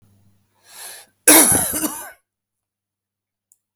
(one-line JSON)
{"cough_length": "3.8 s", "cough_amplitude": 32768, "cough_signal_mean_std_ratio": 0.31, "survey_phase": "beta (2021-08-13 to 2022-03-07)", "age": "45-64", "gender": "Male", "wearing_mask": "No", "symptom_none": true, "smoker_status": "Ex-smoker", "respiratory_condition_asthma": false, "respiratory_condition_other": false, "recruitment_source": "REACT", "submission_delay": "2 days", "covid_test_result": "Negative", "covid_test_method": "RT-qPCR", "influenza_a_test_result": "Unknown/Void", "influenza_b_test_result": "Unknown/Void"}